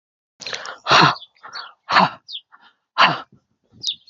{"exhalation_length": "4.1 s", "exhalation_amplitude": 30155, "exhalation_signal_mean_std_ratio": 0.37, "survey_phase": "beta (2021-08-13 to 2022-03-07)", "age": "18-44", "gender": "Female", "wearing_mask": "No", "symptom_none": true, "symptom_onset": "3 days", "smoker_status": "Never smoked", "respiratory_condition_asthma": false, "respiratory_condition_other": false, "recruitment_source": "REACT", "submission_delay": "2 days", "covid_test_result": "Negative", "covid_test_method": "RT-qPCR", "influenza_a_test_result": "Negative", "influenza_b_test_result": "Negative"}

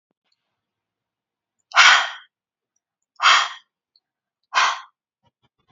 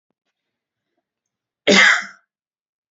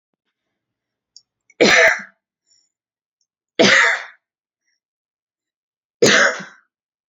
{"exhalation_length": "5.7 s", "exhalation_amplitude": 29452, "exhalation_signal_mean_std_ratio": 0.28, "cough_length": "2.9 s", "cough_amplitude": 29872, "cough_signal_mean_std_ratio": 0.28, "three_cough_length": "7.1 s", "three_cough_amplitude": 31545, "three_cough_signal_mean_std_ratio": 0.32, "survey_phase": "beta (2021-08-13 to 2022-03-07)", "age": "18-44", "gender": "Female", "wearing_mask": "No", "symptom_none": true, "smoker_status": "Current smoker (e-cigarettes or vapes only)", "respiratory_condition_asthma": false, "respiratory_condition_other": false, "recruitment_source": "REACT", "submission_delay": "1 day", "covid_test_result": "Negative", "covid_test_method": "RT-qPCR"}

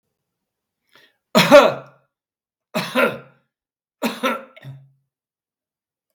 {"three_cough_length": "6.1 s", "three_cough_amplitude": 32768, "three_cough_signal_mean_std_ratio": 0.27, "survey_phase": "beta (2021-08-13 to 2022-03-07)", "age": "65+", "gender": "Male", "wearing_mask": "No", "symptom_none": true, "smoker_status": "Ex-smoker", "respiratory_condition_asthma": false, "respiratory_condition_other": false, "recruitment_source": "REACT", "submission_delay": "5 days", "covid_test_result": "Negative", "covid_test_method": "RT-qPCR", "influenza_a_test_result": "Unknown/Void", "influenza_b_test_result": "Unknown/Void"}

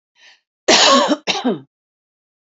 {"cough_length": "2.6 s", "cough_amplitude": 31873, "cough_signal_mean_std_ratio": 0.43, "survey_phase": "beta (2021-08-13 to 2022-03-07)", "age": "18-44", "gender": "Female", "wearing_mask": "No", "symptom_cough_any": true, "symptom_runny_or_blocked_nose": true, "symptom_fatigue": true, "smoker_status": "Current smoker (11 or more cigarettes per day)", "respiratory_condition_asthma": false, "respiratory_condition_other": false, "recruitment_source": "REACT", "submission_delay": "3 days", "covid_test_result": "Negative", "covid_test_method": "RT-qPCR", "influenza_a_test_result": "Unknown/Void", "influenza_b_test_result": "Unknown/Void"}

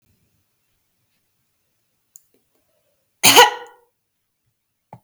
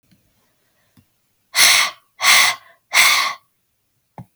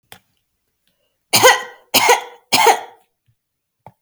{"cough_length": "5.0 s", "cough_amplitude": 32768, "cough_signal_mean_std_ratio": 0.19, "exhalation_length": "4.4 s", "exhalation_amplitude": 32768, "exhalation_signal_mean_std_ratio": 0.4, "three_cough_length": "4.0 s", "three_cough_amplitude": 32768, "three_cough_signal_mean_std_ratio": 0.35, "survey_phase": "beta (2021-08-13 to 2022-03-07)", "age": "18-44", "gender": "Female", "wearing_mask": "No", "symptom_none": true, "smoker_status": "Never smoked", "respiratory_condition_asthma": true, "respiratory_condition_other": false, "recruitment_source": "REACT", "submission_delay": "1 day", "covid_test_result": "Negative", "covid_test_method": "RT-qPCR", "influenza_a_test_result": "Negative", "influenza_b_test_result": "Negative"}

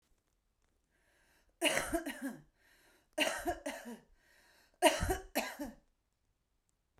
{"three_cough_length": "7.0 s", "three_cough_amplitude": 9374, "three_cough_signal_mean_std_ratio": 0.36, "survey_phase": "beta (2021-08-13 to 2022-03-07)", "age": "45-64", "gender": "Female", "wearing_mask": "No", "symptom_none": true, "smoker_status": "Current smoker (11 or more cigarettes per day)", "respiratory_condition_asthma": true, "respiratory_condition_other": false, "recruitment_source": "Test and Trace", "submission_delay": "2 days", "covid_test_result": "Negative", "covid_test_method": "ePCR"}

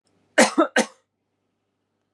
{"cough_length": "2.1 s", "cough_amplitude": 28304, "cough_signal_mean_std_ratio": 0.29, "survey_phase": "beta (2021-08-13 to 2022-03-07)", "age": "45-64", "gender": "Female", "wearing_mask": "No", "symptom_none": true, "smoker_status": "Never smoked", "respiratory_condition_asthma": false, "respiratory_condition_other": false, "recruitment_source": "REACT", "submission_delay": "1 day", "covid_test_result": "Negative", "covid_test_method": "RT-qPCR", "influenza_a_test_result": "Negative", "influenza_b_test_result": "Negative"}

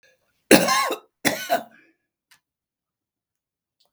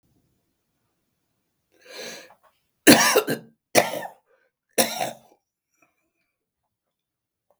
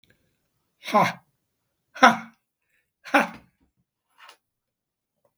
{"cough_length": "3.9 s", "cough_amplitude": 32768, "cough_signal_mean_std_ratio": 0.29, "three_cough_length": "7.6 s", "three_cough_amplitude": 32768, "three_cough_signal_mean_std_ratio": 0.24, "exhalation_length": "5.4 s", "exhalation_amplitude": 32766, "exhalation_signal_mean_std_ratio": 0.22, "survey_phase": "beta (2021-08-13 to 2022-03-07)", "age": "65+", "gender": "Male", "wearing_mask": "No", "symptom_cough_any": true, "symptom_diarrhoea": true, "symptom_fatigue": true, "symptom_onset": "12 days", "smoker_status": "Ex-smoker", "respiratory_condition_asthma": false, "respiratory_condition_other": false, "recruitment_source": "REACT", "submission_delay": "3 days", "covid_test_result": "Negative", "covid_test_method": "RT-qPCR", "influenza_a_test_result": "Negative", "influenza_b_test_result": "Negative"}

